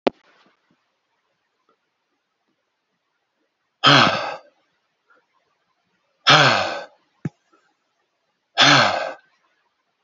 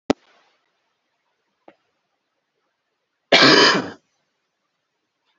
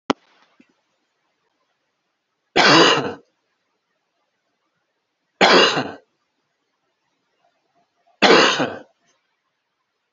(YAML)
exhalation_length: 10.0 s
exhalation_amplitude: 30737
exhalation_signal_mean_std_ratio: 0.29
cough_length: 5.4 s
cough_amplitude: 30269
cough_signal_mean_std_ratio: 0.25
three_cough_length: 10.1 s
three_cough_amplitude: 31640
three_cough_signal_mean_std_ratio: 0.3
survey_phase: beta (2021-08-13 to 2022-03-07)
age: 18-44
gender: Male
wearing_mask: 'No'
symptom_cough_any: true
symptom_runny_or_blocked_nose: true
symptom_headache: true
symptom_onset: 2 days
smoker_status: Never smoked
respiratory_condition_asthma: false
respiratory_condition_other: false
recruitment_source: Test and Trace
submission_delay: 1 day
covid_test_result: Positive
covid_test_method: RT-qPCR